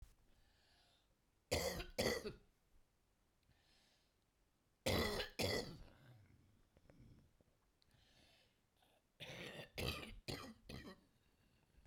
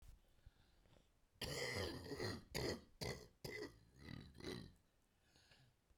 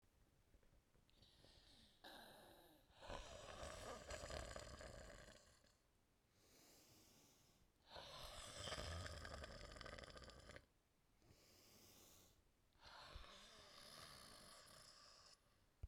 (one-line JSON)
{"three_cough_length": "11.9 s", "three_cough_amplitude": 1898, "three_cough_signal_mean_std_ratio": 0.38, "cough_length": "6.0 s", "cough_amplitude": 1168, "cough_signal_mean_std_ratio": 0.55, "exhalation_length": "15.9 s", "exhalation_amplitude": 683, "exhalation_signal_mean_std_ratio": 0.66, "survey_phase": "beta (2021-08-13 to 2022-03-07)", "age": "65+", "gender": "Female", "wearing_mask": "No", "symptom_cough_any": true, "symptom_shortness_of_breath": true, "symptom_fatigue": true, "symptom_onset": "8 days", "smoker_status": "Ex-smoker", "respiratory_condition_asthma": true, "respiratory_condition_other": true, "recruitment_source": "REACT", "submission_delay": "2 days", "covid_test_result": "Negative", "covid_test_method": "RT-qPCR"}